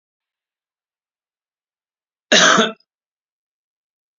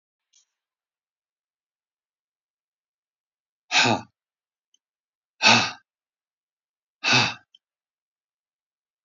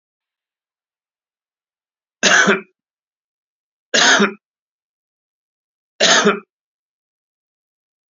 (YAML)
cough_length: 4.2 s
cough_amplitude: 31281
cough_signal_mean_std_ratio: 0.24
exhalation_length: 9.0 s
exhalation_amplitude: 21770
exhalation_signal_mean_std_ratio: 0.23
three_cough_length: 8.1 s
three_cough_amplitude: 31486
three_cough_signal_mean_std_ratio: 0.29
survey_phase: beta (2021-08-13 to 2022-03-07)
age: 65+
gender: Male
wearing_mask: 'No'
symptom_none: true
smoker_status: Never smoked
respiratory_condition_asthma: false
respiratory_condition_other: false
recruitment_source: REACT
submission_delay: 2 days
covid_test_result: Negative
covid_test_method: RT-qPCR